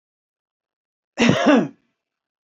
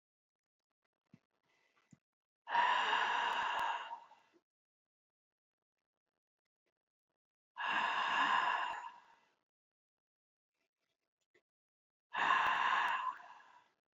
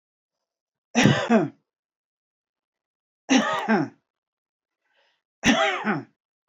{
  "cough_length": "2.5 s",
  "cough_amplitude": 29643,
  "cough_signal_mean_std_ratio": 0.34,
  "exhalation_length": "14.0 s",
  "exhalation_amplitude": 3663,
  "exhalation_signal_mean_std_ratio": 0.43,
  "three_cough_length": "6.5 s",
  "three_cough_amplitude": 23922,
  "three_cough_signal_mean_std_ratio": 0.38,
  "survey_phase": "beta (2021-08-13 to 2022-03-07)",
  "age": "65+",
  "gender": "Male",
  "wearing_mask": "No",
  "symptom_none": true,
  "smoker_status": "Never smoked",
  "respiratory_condition_asthma": false,
  "respiratory_condition_other": false,
  "recruitment_source": "REACT",
  "submission_delay": "1 day",
  "covid_test_result": "Negative",
  "covid_test_method": "RT-qPCR"
}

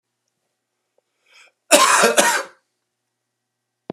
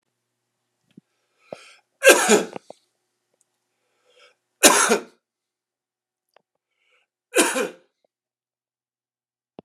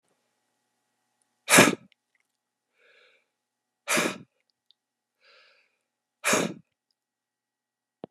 {
  "cough_length": "3.9 s",
  "cough_amplitude": 32768,
  "cough_signal_mean_std_ratio": 0.33,
  "three_cough_length": "9.6 s",
  "three_cough_amplitude": 32768,
  "three_cough_signal_mean_std_ratio": 0.24,
  "exhalation_length": "8.1 s",
  "exhalation_amplitude": 27268,
  "exhalation_signal_mean_std_ratio": 0.21,
  "survey_phase": "beta (2021-08-13 to 2022-03-07)",
  "age": "45-64",
  "gender": "Male",
  "wearing_mask": "No",
  "symptom_cough_any": true,
  "symptom_runny_or_blocked_nose": true,
  "symptom_headache": true,
  "symptom_change_to_sense_of_smell_or_taste": true,
  "symptom_loss_of_taste": true,
  "symptom_onset": "3 days",
  "smoker_status": "Never smoked",
  "respiratory_condition_asthma": false,
  "respiratory_condition_other": false,
  "recruitment_source": "Test and Trace",
  "submission_delay": "2 days",
  "covid_test_result": "Positive",
  "covid_test_method": "RT-qPCR",
  "covid_ct_value": 17.5,
  "covid_ct_gene": "ORF1ab gene"
}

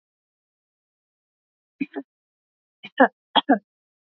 {
  "three_cough_length": "4.2 s",
  "three_cough_amplitude": 27130,
  "three_cough_signal_mean_std_ratio": 0.18,
  "survey_phase": "beta (2021-08-13 to 2022-03-07)",
  "age": "18-44",
  "gender": "Female",
  "wearing_mask": "No",
  "symptom_none": true,
  "smoker_status": "Never smoked",
  "respiratory_condition_asthma": false,
  "respiratory_condition_other": false,
  "recruitment_source": "REACT",
  "submission_delay": "6 days",
  "covid_test_result": "Negative",
  "covid_test_method": "RT-qPCR",
  "influenza_a_test_result": "Negative",
  "influenza_b_test_result": "Negative"
}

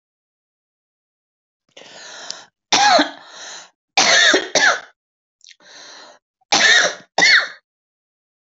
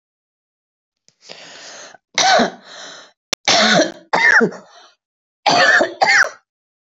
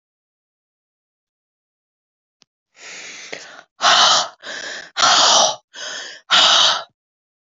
{
  "three_cough_length": "8.4 s",
  "three_cough_amplitude": 31617,
  "three_cough_signal_mean_std_ratio": 0.4,
  "cough_length": "6.9 s",
  "cough_amplitude": 27719,
  "cough_signal_mean_std_ratio": 0.46,
  "exhalation_length": "7.5 s",
  "exhalation_amplitude": 32768,
  "exhalation_signal_mean_std_ratio": 0.41,
  "survey_phase": "beta (2021-08-13 to 2022-03-07)",
  "age": "45-64",
  "gender": "Female",
  "wearing_mask": "No",
  "symptom_cough_any": true,
  "symptom_runny_or_blocked_nose": true,
  "symptom_sore_throat": true,
  "symptom_headache": true,
  "symptom_onset": "4 days",
  "smoker_status": "Never smoked",
  "respiratory_condition_asthma": false,
  "respiratory_condition_other": false,
  "recruitment_source": "Test and Trace",
  "submission_delay": "1 day",
  "covid_test_result": "Positive",
  "covid_test_method": "RT-qPCR",
  "covid_ct_value": 13.6,
  "covid_ct_gene": "ORF1ab gene",
  "covid_ct_mean": 13.8,
  "covid_viral_load": "29000000 copies/ml",
  "covid_viral_load_category": "High viral load (>1M copies/ml)"
}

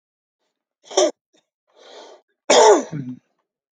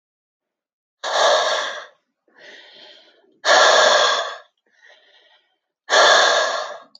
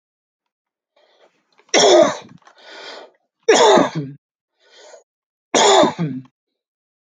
{
  "cough_length": "3.8 s",
  "cough_amplitude": 27532,
  "cough_signal_mean_std_ratio": 0.31,
  "exhalation_length": "7.0 s",
  "exhalation_amplitude": 26620,
  "exhalation_signal_mean_std_ratio": 0.48,
  "three_cough_length": "7.1 s",
  "three_cough_amplitude": 30422,
  "three_cough_signal_mean_std_ratio": 0.38,
  "survey_phase": "alpha (2021-03-01 to 2021-08-12)",
  "age": "65+",
  "gender": "Male",
  "wearing_mask": "No",
  "symptom_fatigue": true,
  "smoker_status": "Never smoked",
  "respiratory_condition_asthma": false,
  "respiratory_condition_other": false,
  "recruitment_source": "REACT",
  "submission_delay": "1 day",
  "covid_test_result": "Negative",
  "covid_test_method": "RT-qPCR"
}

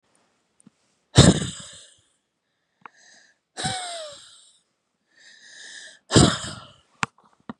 {
  "exhalation_length": "7.6 s",
  "exhalation_amplitude": 32763,
  "exhalation_signal_mean_std_ratio": 0.25,
  "survey_phase": "beta (2021-08-13 to 2022-03-07)",
  "age": "45-64",
  "gender": "Female",
  "wearing_mask": "No",
  "symptom_shortness_of_breath": true,
  "symptom_fatigue": true,
  "symptom_onset": "12 days",
  "smoker_status": "Never smoked",
  "respiratory_condition_asthma": true,
  "respiratory_condition_other": false,
  "recruitment_source": "REACT",
  "submission_delay": "2 days",
  "covid_test_result": "Negative",
  "covid_test_method": "RT-qPCR",
  "influenza_a_test_result": "Negative",
  "influenza_b_test_result": "Negative"
}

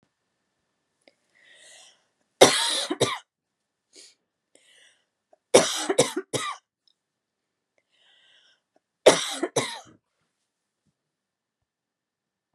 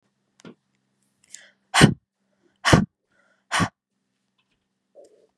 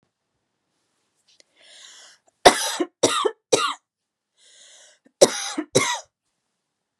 {
  "three_cough_length": "12.5 s",
  "three_cough_amplitude": 32767,
  "three_cough_signal_mean_std_ratio": 0.24,
  "exhalation_length": "5.4 s",
  "exhalation_amplitude": 32612,
  "exhalation_signal_mean_std_ratio": 0.22,
  "cough_length": "7.0 s",
  "cough_amplitude": 32768,
  "cough_signal_mean_std_ratio": 0.28,
  "survey_phase": "beta (2021-08-13 to 2022-03-07)",
  "age": "45-64",
  "gender": "Female",
  "wearing_mask": "No",
  "symptom_cough_any": true,
  "symptom_runny_or_blocked_nose": true,
  "symptom_fatigue": true,
  "symptom_headache": true,
  "symptom_other": true,
  "symptom_onset": "3 days",
  "smoker_status": "Never smoked",
  "respiratory_condition_asthma": false,
  "respiratory_condition_other": false,
  "recruitment_source": "Test and Trace",
  "submission_delay": "1 day",
  "covid_test_result": "Positive",
  "covid_test_method": "RT-qPCR",
  "covid_ct_value": 23.8,
  "covid_ct_gene": "ORF1ab gene",
  "covid_ct_mean": 24.0,
  "covid_viral_load": "13000 copies/ml",
  "covid_viral_load_category": "Low viral load (10K-1M copies/ml)"
}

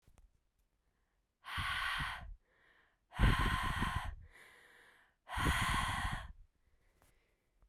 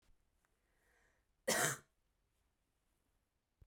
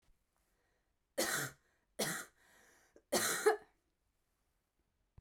{
  "exhalation_length": "7.7 s",
  "exhalation_amplitude": 4473,
  "exhalation_signal_mean_std_ratio": 0.48,
  "cough_length": "3.7 s",
  "cough_amplitude": 4162,
  "cough_signal_mean_std_ratio": 0.23,
  "three_cough_length": "5.2 s",
  "three_cough_amplitude": 4310,
  "three_cough_signal_mean_std_ratio": 0.33,
  "survey_phase": "beta (2021-08-13 to 2022-03-07)",
  "age": "18-44",
  "gender": "Female",
  "wearing_mask": "No",
  "symptom_cough_any": true,
  "smoker_status": "Ex-smoker",
  "respiratory_condition_asthma": false,
  "respiratory_condition_other": false,
  "recruitment_source": "Test and Trace",
  "submission_delay": "2 days",
  "covid_test_result": "Positive",
  "covid_test_method": "RT-qPCR",
  "covid_ct_value": 32.6,
  "covid_ct_gene": "N gene"
}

